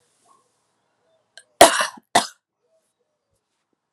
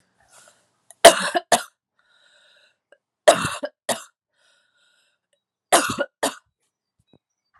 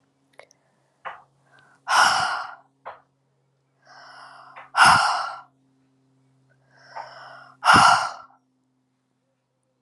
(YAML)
cough_length: 3.9 s
cough_amplitude: 32768
cough_signal_mean_std_ratio: 0.19
three_cough_length: 7.6 s
three_cough_amplitude: 32768
three_cough_signal_mean_std_ratio: 0.23
exhalation_length: 9.8 s
exhalation_amplitude: 26313
exhalation_signal_mean_std_ratio: 0.32
survey_phase: alpha (2021-03-01 to 2021-08-12)
age: 18-44
gender: Female
wearing_mask: 'No'
symptom_cough_any: true
symptom_diarrhoea: true
symptom_fatigue: true
symptom_change_to_sense_of_smell_or_taste: true
symptom_loss_of_taste: true
symptom_onset: 5 days
smoker_status: Current smoker (e-cigarettes or vapes only)
respiratory_condition_asthma: false
respiratory_condition_other: false
recruitment_source: Test and Trace
submission_delay: 2 days
covid_test_result: Positive
covid_test_method: RT-qPCR
covid_ct_value: 16.4
covid_ct_gene: ORF1ab gene
covid_ct_mean: 16.6
covid_viral_load: 3500000 copies/ml
covid_viral_load_category: High viral load (>1M copies/ml)